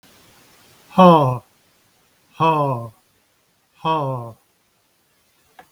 {"exhalation_length": "5.7 s", "exhalation_amplitude": 32768, "exhalation_signal_mean_std_ratio": 0.33, "survey_phase": "beta (2021-08-13 to 2022-03-07)", "age": "45-64", "gender": "Male", "wearing_mask": "No", "symptom_cough_any": true, "smoker_status": "Never smoked", "respiratory_condition_asthma": false, "respiratory_condition_other": false, "recruitment_source": "REACT", "submission_delay": "2 days", "covid_test_result": "Negative", "covid_test_method": "RT-qPCR", "influenza_a_test_result": "Negative", "influenza_b_test_result": "Negative"}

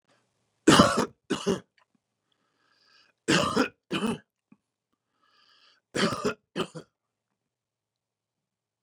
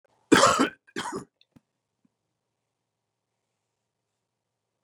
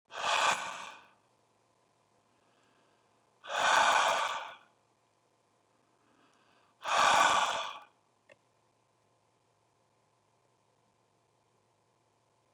{"three_cough_length": "8.8 s", "three_cough_amplitude": 20116, "three_cough_signal_mean_std_ratio": 0.29, "cough_length": "4.8 s", "cough_amplitude": 21941, "cough_signal_mean_std_ratio": 0.22, "exhalation_length": "12.5 s", "exhalation_amplitude": 7180, "exhalation_signal_mean_std_ratio": 0.34, "survey_phase": "beta (2021-08-13 to 2022-03-07)", "age": "65+", "gender": "Male", "wearing_mask": "No", "symptom_none": true, "smoker_status": "Ex-smoker", "respiratory_condition_asthma": false, "respiratory_condition_other": false, "recruitment_source": "REACT", "submission_delay": "1 day", "covid_test_result": "Negative", "covid_test_method": "RT-qPCR", "influenza_a_test_result": "Negative", "influenza_b_test_result": "Negative"}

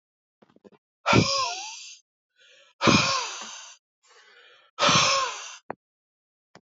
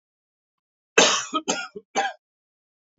{"exhalation_length": "6.7 s", "exhalation_amplitude": 18552, "exhalation_signal_mean_std_ratio": 0.41, "cough_length": "3.0 s", "cough_amplitude": 26484, "cough_signal_mean_std_ratio": 0.33, "survey_phase": "alpha (2021-03-01 to 2021-08-12)", "age": "45-64", "gender": "Male", "wearing_mask": "No", "symptom_cough_any": true, "symptom_new_continuous_cough": true, "symptom_headache": true, "symptom_change_to_sense_of_smell_or_taste": true, "symptom_loss_of_taste": true, "symptom_onset": "7 days", "smoker_status": "Never smoked", "respiratory_condition_asthma": false, "respiratory_condition_other": false, "recruitment_source": "Test and Trace", "submission_delay": "2 days", "covid_test_result": "Positive", "covid_test_method": "RT-qPCR"}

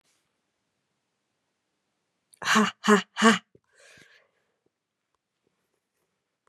{"exhalation_length": "6.5 s", "exhalation_amplitude": 23177, "exhalation_signal_mean_std_ratio": 0.23, "survey_phase": "beta (2021-08-13 to 2022-03-07)", "age": "18-44", "gender": "Female", "wearing_mask": "No", "symptom_runny_or_blocked_nose": true, "symptom_onset": "15 days", "smoker_status": "Never smoked", "respiratory_condition_asthma": false, "respiratory_condition_other": false, "recruitment_source": "Test and Trace", "submission_delay": "14 days", "covid_test_result": "Negative", "covid_test_method": "ePCR"}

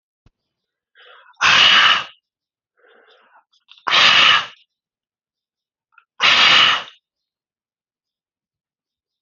{"exhalation_length": "9.2 s", "exhalation_amplitude": 32147, "exhalation_signal_mean_std_ratio": 0.37, "survey_phase": "alpha (2021-03-01 to 2021-08-12)", "age": "45-64", "gender": "Male", "wearing_mask": "No", "symptom_none": true, "smoker_status": "Ex-smoker", "respiratory_condition_asthma": false, "respiratory_condition_other": false, "recruitment_source": "REACT", "submission_delay": "2 days", "covid_test_result": "Negative", "covid_test_method": "RT-qPCR"}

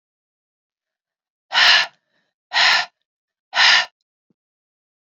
{"exhalation_length": "5.1 s", "exhalation_amplitude": 28408, "exhalation_signal_mean_std_ratio": 0.34, "survey_phase": "beta (2021-08-13 to 2022-03-07)", "age": "45-64", "gender": "Female", "wearing_mask": "No", "symptom_none": true, "smoker_status": "Never smoked", "respiratory_condition_asthma": false, "respiratory_condition_other": false, "recruitment_source": "Test and Trace", "submission_delay": "1 day", "covid_test_result": "Negative", "covid_test_method": "RT-qPCR"}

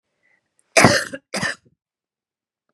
{"cough_length": "2.7 s", "cough_amplitude": 32768, "cough_signal_mean_std_ratio": 0.29, "survey_phase": "beta (2021-08-13 to 2022-03-07)", "age": "45-64", "gender": "Female", "wearing_mask": "No", "symptom_cough_any": true, "symptom_fatigue": true, "symptom_headache": true, "symptom_loss_of_taste": true, "smoker_status": "Ex-smoker", "respiratory_condition_asthma": false, "respiratory_condition_other": false, "recruitment_source": "Test and Trace", "submission_delay": "2 days", "covid_test_result": "Positive", "covid_test_method": "ePCR"}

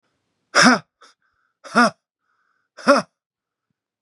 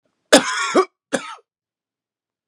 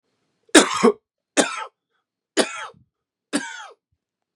{"exhalation_length": "4.0 s", "exhalation_amplitude": 32692, "exhalation_signal_mean_std_ratio": 0.28, "cough_length": "2.5 s", "cough_amplitude": 32768, "cough_signal_mean_std_ratio": 0.32, "three_cough_length": "4.4 s", "three_cough_amplitude": 32768, "three_cough_signal_mean_std_ratio": 0.29, "survey_phase": "beta (2021-08-13 to 2022-03-07)", "age": "45-64", "gender": "Male", "wearing_mask": "No", "symptom_cough_any": true, "symptom_runny_or_blocked_nose": true, "symptom_onset": "4 days", "smoker_status": "Never smoked", "respiratory_condition_asthma": false, "respiratory_condition_other": false, "recruitment_source": "Test and Trace", "submission_delay": "2 days", "covid_test_result": "Positive", "covid_test_method": "RT-qPCR", "covid_ct_value": 16.4, "covid_ct_gene": "ORF1ab gene", "covid_ct_mean": 16.8, "covid_viral_load": "3000000 copies/ml", "covid_viral_load_category": "High viral load (>1M copies/ml)"}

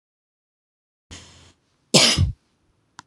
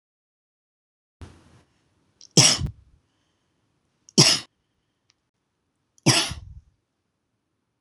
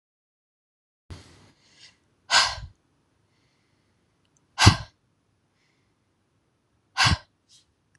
{"cough_length": "3.1 s", "cough_amplitude": 26028, "cough_signal_mean_std_ratio": 0.28, "three_cough_length": "7.8 s", "three_cough_amplitude": 26027, "three_cough_signal_mean_std_ratio": 0.23, "exhalation_length": "8.0 s", "exhalation_amplitude": 26027, "exhalation_signal_mean_std_ratio": 0.21, "survey_phase": "beta (2021-08-13 to 2022-03-07)", "age": "18-44", "gender": "Female", "wearing_mask": "No", "symptom_fatigue": true, "symptom_headache": true, "smoker_status": "Never smoked", "respiratory_condition_asthma": true, "respiratory_condition_other": false, "recruitment_source": "REACT", "submission_delay": "1 day", "covid_test_result": "Negative", "covid_test_method": "RT-qPCR"}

